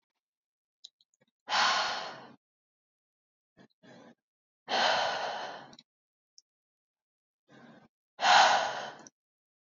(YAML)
exhalation_length: 9.7 s
exhalation_amplitude: 11402
exhalation_signal_mean_std_ratio: 0.34
survey_phase: beta (2021-08-13 to 2022-03-07)
age: 18-44
gender: Female
wearing_mask: 'No'
symptom_none: true
smoker_status: Never smoked
respiratory_condition_asthma: false
respiratory_condition_other: false
recruitment_source: REACT
submission_delay: 0 days
covid_test_result: Negative
covid_test_method: RT-qPCR